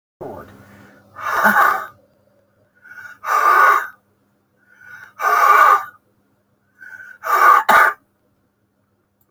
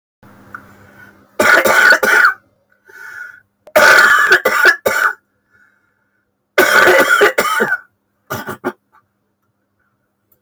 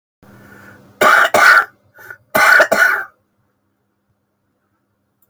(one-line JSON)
{"exhalation_length": "9.3 s", "exhalation_amplitude": 30224, "exhalation_signal_mean_std_ratio": 0.44, "three_cough_length": "10.4 s", "three_cough_amplitude": 32767, "three_cough_signal_mean_std_ratio": 0.5, "cough_length": "5.3 s", "cough_amplitude": 32397, "cough_signal_mean_std_ratio": 0.41, "survey_phase": "beta (2021-08-13 to 2022-03-07)", "age": "65+", "gender": "Male", "wearing_mask": "No", "symptom_cough_any": true, "symptom_runny_or_blocked_nose": true, "symptom_fever_high_temperature": true, "symptom_headache": true, "smoker_status": "Never smoked", "respiratory_condition_asthma": false, "respiratory_condition_other": true, "recruitment_source": "Test and Trace", "submission_delay": "3 days", "covid_test_result": "Positive", "covid_test_method": "RT-qPCR", "covid_ct_value": 24.2, "covid_ct_gene": "ORF1ab gene"}